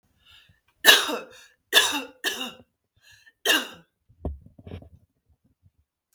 {"three_cough_length": "6.1 s", "three_cough_amplitude": 32768, "three_cough_signal_mean_std_ratio": 0.29, "survey_phase": "beta (2021-08-13 to 2022-03-07)", "age": "18-44", "gender": "Female", "wearing_mask": "No", "symptom_none": true, "smoker_status": "Ex-smoker", "respiratory_condition_asthma": false, "respiratory_condition_other": false, "recruitment_source": "REACT", "submission_delay": "1 day", "covid_test_result": "Negative", "covid_test_method": "RT-qPCR"}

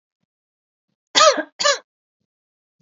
{"cough_length": "2.8 s", "cough_amplitude": 31329, "cough_signal_mean_std_ratio": 0.28, "survey_phase": "beta (2021-08-13 to 2022-03-07)", "age": "65+", "gender": "Female", "wearing_mask": "No", "symptom_none": true, "smoker_status": "Never smoked", "respiratory_condition_asthma": false, "respiratory_condition_other": false, "recruitment_source": "REACT", "submission_delay": "1 day", "covid_test_result": "Negative", "covid_test_method": "RT-qPCR", "influenza_a_test_result": "Unknown/Void", "influenza_b_test_result": "Unknown/Void"}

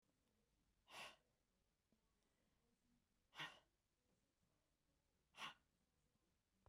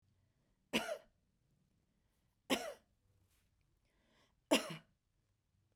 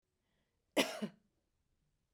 {"exhalation_length": "6.7 s", "exhalation_amplitude": 286, "exhalation_signal_mean_std_ratio": 0.29, "three_cough_length": "5.8 s", "three_cough_amplitude": 4577, "three_cough_signal_mean_std_ratio": 0.23, "cough_length": "2.1 s", "cough_amplitude": 5149, "cough_signal_mean_std_ratio": 0.24, "survey_phase": "beta (2021-08-13 to 2022-03-07)", "age": "45-64", "gender": "Female", "wearing_mask": "No", "symptom_none": true, "smoker_status": "Ex-smoker", "respiratory_condition_asthma": false, "respiratory_condition_other": false, "recruitment_source": "REACT", "submission_delay": "2 days", "covid_test_result": "Negative", "covid_test_method": "RT-qPCR", "influenza_a_test_result": "Negative", "influenza_b_test_result": "Negative"}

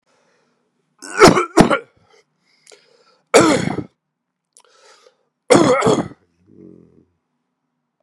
{"three_cough_length": "8.0 s", "three_cough_amplitude": 32768, "three_cough_signal_mean_std_ratio": 0.32, "survey_phase": "beta (2021-08-13 to 2022-03-07)", "age": "45-64", "gender": "Male", "wearing_mask": "No", "symptom_cough_any": true, "symptom_runny_or_blocked_nose": true, "symptom_headache": true, "symptom_change_to_sense_of_smell_or_taste": true, "symptom_loss_of_taste": true, "symptom_onset": "3 days", "smoker_status": "Never smoked", "respiratory_condition_asthma": false, "respiratory_condition_other": false, "recruitment_source": "Test and Trace", "submission_delay": "1 day", "covid_test_result": "Positive", "covid_test_method": "RT-qPCR"}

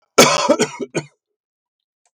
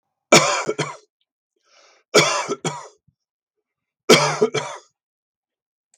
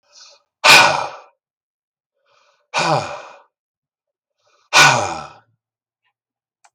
{"cough_length": "2.1 s", "cough_amplitude": 32768, "cough_signal_mean_std_ratio": 0.38, "three_cough_length": "6.0 s", "three_cough_amplitude": 32768, "three_cough_signal_mean_std_ratio": 0.34, "exhalation_length": "6.7 s", "exhalation_amplitude": 32768, "exhalation_signal_mean_std_ratio": 0.31, "survey_phase": "beta (2021-08-13 to 2022-03-07)", "age": "65+", "gender": "Male", "wearing_mask": "No", "symptom_none": true, "smoker_status": "Never smoked", "respiratory_condition_asthma": false, "respiratory_condition_other": false, "recruitment_source": "REACT", "submission_delay": "2 days", "covid_test_result": "Negative", "covid_test_method": "RT-qPCR", "influenza_a_test_result": "Negative", "influenza_b_test_result": "Negative"}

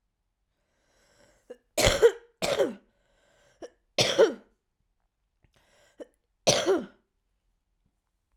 {"three_cough_length": "8.4 s", "three_cough_amplitude": 15899, "three_cough_signal_mean_std_ratio": 0.3, "survey_phase": "beta (2021-08-13 to 2022-03-07)", "age": "18-44", "gender": "Female", "wearing_mask": "No", "symptom_cough_any": true, "symptom_headache": true, "symptom_onset": "12 days", "smoker_status": "Current smoker (11 or more cigarettes per day)", "respiratory_condition_asthma": false, "respiratory_condition_other": false, "recruitment_source": "REACT", "submission_delay": "3 days", "covid_test_result": "Negative", "covid_test_method": "RT-qPCR", "influenza_a_test_result": "Negative", "influenza_b_test_result": "Negative"}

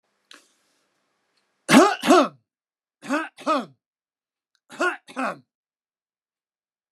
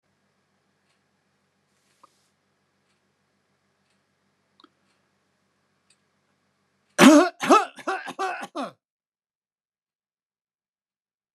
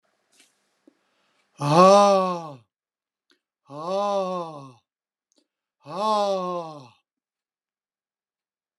{"three_cough_length": "6.9 s", "three_cough_amplitude": 28362, "three_cough_signal_mean_std_ratio": 0.28, "cough_length": "11.3 s", "cough_amplitude": 29203, "cough_signal_mean_std_ratio": 0.19, "exhalation_length": "8.8 s", "exhalation_amplitude": 24973, "exhalation_signal_mean_std_ratio": 0.35, "survey_phase": "beta (2021-08-13 to 2022-03-07)", "age": "65+", "gender": "Male", "wearing_mask": "No", "symptom_none": true, "smoker_status": "Never smoked", "respiratory_condition_asthma": false, "respiratory_condition_other": false, "recruitment_source": "REACT", "submission_delay": "2 days", "covid_test_result": "Negative", "covid_test_method": "RT-qPCR"}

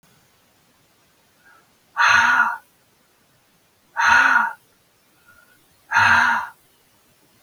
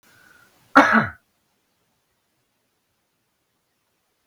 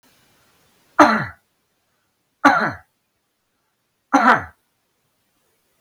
{"exhalation_length": "7.4 s", "exhalation_amplitude": 25571, "exhalation_signal_mean_std_ratio": 0.4, "cough_length": "4.3 s", "cough_amplitude": 32768, "cough_signal_mean_std_ratio": 0.2, "three_cough_length": "5.8 s", "three_cough_amplitude": 32768, "three_cough_signal_mean_std_ratio": 0.28, "survey_phase": "beta (2021-08-13 to 2022-03-07)", "age": "65+", "gender": "Male", "wearing_mask": "No", "symptom_none": true, "smoker_status": "Never smoked", "respiratory_condition_asthma": false, "respiratory_condition_other": false, "recruitment_source": "REACT", "submission_delay": "2 days", "covid_test_result": "Negative", "covid_test_method": "RT-qPCR", "influenza_a_test_result": "Unknown/Void", "influenza_b_test_result": "Unknown/Void"}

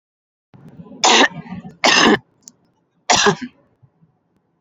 {"three_cough_length": "4.6 s", "three_cough_amplitude": 32767, "three_cough_signal_mean_std_ratio": 0.38, "survey_phase": "beta (2021-08-13 to 2022-03-07)", "age": "18-44", "gender": "Female", "wearing_mask": "No", "symptom_cough_any": true, "symptom_runny_or_blocked_nose": true, "symptom_onset": "3 days", "smoker_status": "Never smoked", "respiratory_condition_asthma": false, "respiratory_condition_other": false, "recruitment_source": "REACT", "submission_delay": "2 days", "covid_test_result": "Negative", "covid_test_method": "RT-qPCR", "influenza_a_test_result": "Negative", "influenza_b_test_result": "Negative"}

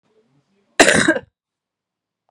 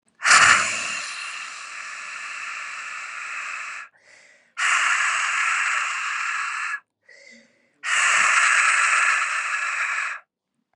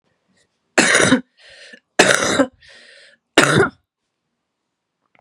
{"cough_length": "2.3 s", "cough_amplitude": 32768, "cough_signal_mean_std_ratio": 0.29, "exhalation_length": "10.8 s", "exhalation_amplitude": 32216, "exhalation_signal_mean_std_ratio": 0.67, "three_cough_length": "5.2 s", "three_cough_amplitude": 32768, "three_cough_signal_mean_std_ratio": 0.38, "survey_phase": "beta (2021-08-13 to 2022-03-07)", "age": "18-44", "gender": "Female", "wearing_mask": "No", "symptom_cough_any": true, "symptom_runny_or_blocked_nose": true, "symptom_fatigue": true, "symptom_headache": true, "symptom_change_to_sense_of_smell_or_taste": true, "symptom_loss_of_taste": true, "symptom_other": true, "symptom_onset": "3 days", "smoker_status": "Never smoked", "respiratory_condition_asthma": false, "respiratory_condition_other": false, "recruitment_source": "Test and Trace", "submission_delay": "2 days", "covid_test_result": "Positive", "covid_test_method": "RT-qPCR", "covid_ct_value": 16.4, "covid_ct_gene": "ORF1ab gene", "covid_ct_mean": 16.7, "covid_viral_load": "3300000 copies/ml", "covid_viral_load_category": "High viral load (>1M copies/ml)"}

